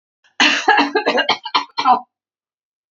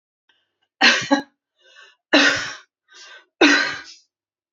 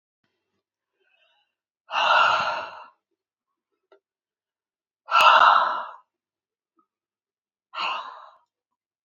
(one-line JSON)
{"cough_length": "2.9 s", "cough_amplitude": 28353, "cough_signal_mean_std_ratio": 0.51, "three_cough_length": "4.5 s", "three_cough_amplitude": 31164, "three_cough_signal_mean_std_ratio": 0.37, "exhalation_length": "9.0 s", "exhalation_amplitude": 24243, "exhalation_signal_mean_std_ratio": 0.32, "survey_phase": "beta (2021-08-13 to 2022-03-07)", "age": "18-44", "gender": "Female", "wearing_mask": "No", "symptom_none": true, "smoker_status": "Prefer not to say", "respiratory_condition_asthma": false, "respiratory_condition_other": false, "recruitment_source": "REACT", "submission_delay": "2 days", "covid_test_result": "Negative", "covid_test_method": "RT-qPCR", "influenza_a_test_result": "Negative", "influenza_b_test_result": "Negative"}